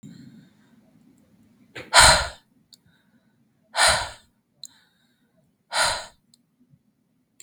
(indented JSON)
{
  "exhalation_length": "7.4 s",
  "exhalation_amplitude": 32768,
  "exhalation_signal_mean_std_ratio": 0.26,
  "survey_phase": "beta (2021-08-13 to 2022-03-07)",
  "age": "18-44",
  "gender": "Female",
  "wearing_mask": "No",
  "symptom_none": true,
  "smoker_status": "Never smoked",
  "respiratory_condition_asthma": true,
  "respiratory_condition_other": false,
  "recruitment_source": "REACT",
  "submission_delay": "2 days",
  "covid_test_result": "Negative",
  "covid_test_method": "RT-qPCR",
  "influenza_a_test_result": "Negative",
  "influenza_b_test_result": "Negative"
}